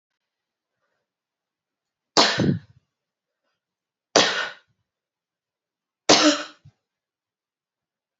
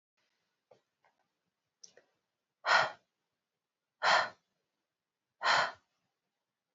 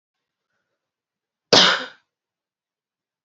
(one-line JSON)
{"three_cough_length": "8.2 s", "three_cough_amplitude": 31945, "three_cough_signal_mean_std_ratio": 0.26, "exhalation_length": "6.7 s", "exhalation_amplitude": 6516, "exhalation_signal_mean_std_ratio": 0.26, "cough_length": "3.2 s", "cough_amplitude": 31297, "cough_signal_mean_std_ratio": 0.22, "survey_phase": "beta (2021-08-13 to 2022-03-07)", "age": "18-44", "gender": "Female", "wearing_mask": "No", "symptom_runny_or_blocked_nose": true, "symptom_sore_throat": true, "symptom_fatigue": true, "symptom_headache": true, "smoker_status": "Ex-smoker", "respiratory_condition_asthma": false, "respiratory_condition_other": false, "recruitment_source": "Test and Trace", "submission_delay": "1 day", "covid_test_result": "Positive", "covid_test_method": "LFT"}